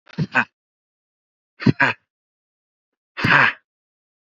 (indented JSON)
{
  "exhalation_length": "4.4 s",
  "exhalation_amplitude": 32767,
  "exhalation_signal_mean_std_ratio": 0.3,
  "survey_phase": "beta (2021-08-13 to 2022-03-07)",
  "age": "18-44",
  "gender": "Male",
  "wearing_mask": "No",
  "symptom_none": true,
  "smoker_status": "Ex-smoker",
  "respiratory_condition_asthma": false,
  "respiratory_condition_other": false,
  "recruitment_source": "REACT",
  "submission_delay": "1 day",
  "covid_test_result": "Negative",
  "covid_test_method": "RT-qPCR",
  "influenza_a_test_result": "Negative",
  "influenza_b_test_result": "Negative"
}